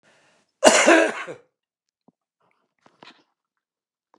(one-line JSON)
{"cough_length": "4.2 s", "cough_amplitude": 29204, "cough_signal_mean_std_ratio": 0.27, "survey_phase": "beta (2021-08-13 to 2022-03-07)", "age": "65+", "gender": "Male", "wearing_mask": "No", "symptom_none": true, "smoker_status": "Never smoked", "respiratory_condition_asthma": false, "respiratory_condition_other": false, "recruitment_source": "REACT", "submission_delay": "4 days", "covid_test_result": "Negative", "covid_test_method": "RT-qPCR"}